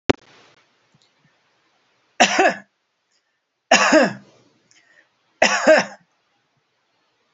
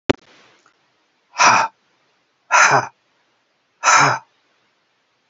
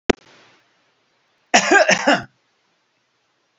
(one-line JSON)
{"three_cough_length": "7.3 s", "three_cough_amplitude": 29775, "three_cough_signal_mean_std_ratio": 0.3, "exhalation_length": "5.3 s", "exhalation_amplitude": 30324, "exhalation_signal_mean_std_ratio": 0.35, "cough_length": "3.6 s", "cough_amplitude": 30927, "cough_signal_mean_std_ratio": 0.31, "survey_phase": "alpha (2021-03-01 to 2021-08-12)", "age": "65+", "gender": "Male", "wearing_mask": "No", "symptom_none": true, "smoker_status": "Ex-smoker", "respiratory_condition_asthma": false, "respiratory_condition_other": false, "recruitment_source": "REACT", "submission_delay": "1 day", "covid_test_result": "Negative", "covid_test_method": "RT-qPCR"}